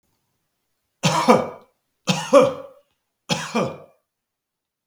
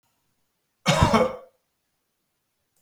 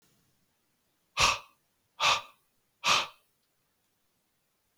three_cough_length: 4.9 s
three_cough_amplitude: 32169
three_cough_signal_mean_std_ratio: 0.35
cough_length: 2.8 s
cough_amplitude: 21312
cough_signal_mean_std_ratio: 0.32
exhalation_length: 4.8 s
exhalation_amplitude: 9158
exhalation_signal_mean_std_ratio: 0.29
survey_phase: beta (2021-08-13 to 2022-03-07)
age: 45-64
gender: Male
wearing_mask: 'No'
symptom_none: true
smoker_status: Never smoked
respiratory_condition_asthma: false
respiratory_condition_other: false
recruitment_source: REACT
submission_delay: 2 days
covid_test_result: Negative
covid_test_method: RT-qPCR
influenza_a_test_result: Negative
influenza_b_test_result: Negative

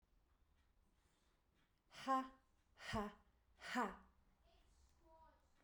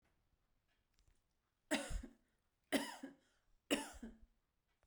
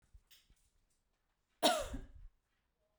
exhalation_length: 5.6 s
exhalation_amplitude: 1157
exhalation_signal_mean_std_ratio: 0.32
three_cough_length: 4.9 s
three_cough_amplitude: 2458
three_cough_signal_mean_std_ratio: 0.31
cough_length: 3.0 s
cough_amplitude: 4674
cough_signal_mean_std_ratio: 0.27
survey_phase: beta (2021-08-13 to 2022-03-07)
age: 45-64
gender: Female
wearing_mask: 'No'
symptom_runny_or_blocked_nose: true
symptom_sore_throat: true
smoker_status: Ex-smoker
respiratory_condition_asthma: false
respiratory_condition_other: false
recruitment_source: REACT
submission_delay: 1 day
covid_test_method: RT-qPCR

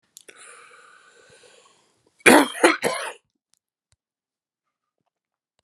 cough_length: 5.6 s
cough_amplitude: 32768
cough_signal_mean_std_ratio: 0.23
survey_phase: beta (2021-08-13 to 2022-03-07)
age: 45-64
gender: Male
wearing_mask: 'No'
symptom_cough_any: true
symptom_runny_or_blocked_nose: true
symptom_shortness_of_breath: true
symptom_fatigue: true
symptom_headache: true
symptom_change_to_sense_of_smell_or_taste: true
symptom_onset: 4 days
smoker_status: Ex-smoker
respiratory_condition_asthma: true
respiratory_condition_other: false
recruitment_source: Test and Trace
submission_delay: 1 day
covid_test_result: Positive
covid_test_method: RT-qPCR
covid_ct_value: 17.5
covid_ct_gene: ORF1ab gene
covid_ct_mean: 17.7
covid_viral_load: 1600000 copies/ml
covid_viral_load_category: High viral load (>1M copies/ml)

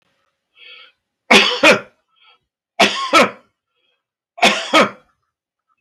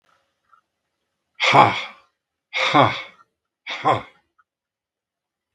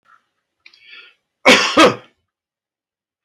three_cough_length: 5.8 s
three_cough_amplitude: 32768
three_cough_signal_mean_std_ratio: 0.37
exhalation_length: 5.5 s
exhalation_amplitude: 32768
exhalation_signal_mean_std_ratio: 0.32
cough_length: 3.2 s
cough_amplitude: 32768
cough_signal_mean_std_ratio: 0.3
survey_phase: beta (2021-08-13 to 2022-03-07)
age: 65+
gender: Male
wearing_mask: 'No'
symptom_none: true
smoker_status: Never smoked
respiratory_condition_asthma: false
respiratory_condition_other: false
recruitment_source: REACT
submission_delay: 3 days
covid_test_result: Negative
covid_test_method: RT-qPCR
influenza_a_test_result: Negative
influenza_b_test_result: Negative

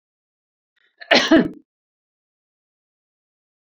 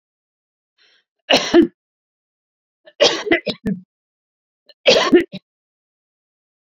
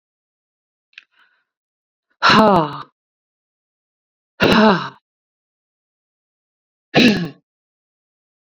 cough_length: 3.7 s
cough_amplitude: 29039
cough_signal_mean_std_ratio: 0.24
three_cough_length: 6.7 s
three_cough_amplitude: 30482
three_cough_signal_mean_std_ratio: 0.31
exhalation_length: 8.5 s
exhalation_amplitude: 29170
exhalation_signal_mean_std_ratio: 0.3
survey_phase: beta (2021-08-13 to 2022-03-07)
age: 45-64
gender: Female
wearing_mask: 'No'
symptom_none: true
symptom_onset: 4 days
smoker_status: Ex-smoker
respiratory_condition_asthma: false
respiratory_condition_other: false
recruitment_source: REACT
submission_delay: 2 days
covid_test_result: Negative
covid_test_method: RT-qPCR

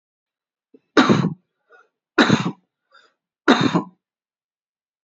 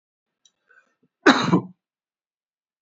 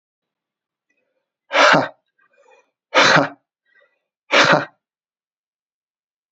three_cough_length: 5.0 s
three_cough_amplitude: 29087
three_cough_signal_mean_std_ratio: 0.33
cough_length: 2.8 s
cough_amplitude: 27220
cough_signal_mean_std_ratio: 0.25
exhalation_length: 6.3 s
exhalation_amplitude: 30830
exhalation_signal_mean_std_ratio: 0.31
survey_phase: beta (2021-08-13 to 2022-03-07)
age: 18-44
gender: Male
wearing_mask: 'No'
symptom_cough_any: true
symptom_runny_or_blocked_nose: true
symptom_headache: true
smoker_status: Never smoked
respiratory_condition_asthma: false
respiratory_condition_other: false
recruitment_source: Test and Trace
submission_delay: 1 day
covid_test_result: Positive
covid_test_method: RT-qPCR
covid_ct_value: 23.9
covid_ct_gene: ORF1ab gene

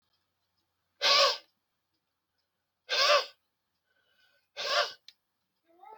exhalation_length: 6.0 s
exhalation_amplitude: 10235
exhalation_signal_mean_std_ratio: 0.32
survey_phase: alpha (2021-03-01 to 2021-08-12)
age: 45-64
gender: Male
wearing_mask: 'No'
symptom_none: true
smoker_status: Never smoked
respiratory_condition_asthma: false
respiratory_condition_other: false
recruitment_source: REACT
submission_delay: 1 day
covid_test_result: Negative
covid_test_method: RT-qPCR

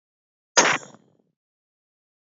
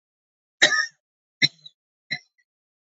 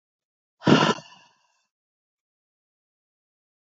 cough_length: 2.4 s
cough_amplitude: 31095
cough_signal_mean_std_ratio: 0.23
three_cough_length: 3.0 s
three_cough_amplitude: 25567
three_cough_signal_mean_std_ratio: 0.24
exhalation_length: 3.7 s
exhalation_amplitude: 26109
exhalation_signal_mean_std_ratio: 0.21
survey_phase: beta (2021-08-13 to 2022-03-07)
age: 18-44
gender: Female
wearing_mask: 'No'
symptom_runny_or_blocked_nose: true
smoker_status: Never smoked
respiratory_condition_asthma: false
respiratory_condition_other: false
recruitment_source: Test and Trace
submission_delay: 1 day
covid_test_result: Positive
covid_test_method: RT-qPCR
covid_ct_value: 24.3
covid_ct_gene: ORF1ab gene
covid_ct_mean: 24.8
covid_viral_load: 7300 copies/ml
covid_viral_load_category: Minimal viral load (< 10K copies/ml)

